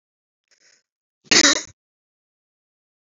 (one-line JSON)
{"cough_length": "3.1 s", "cough_amplitude": 28815, "cough_signal_mean_std_ratio": 0.22, "survey_phase": "beta (2021-08-13 to 2022-03-07)", "age": "45-64", "gender": "Female", "wearing_mask": "No", "symptom_cough_any": true, "symptom_runny_or_blocked_nose": true, "symptom_sore_throat": true, "symptom_fatigue": true, "smoker_status": "Never smoked", "respiratory_condition_asthma": true, "respiratory_condition_other": false, "recruitment_source": "Test and Trace", "submission_delay": "1 day", "covid_test_result": "Positive", "covid_test_method": "RT-qPCR", "covid_ct_value": 27.4, "covid_ct_gene": "ORF1ab gene"}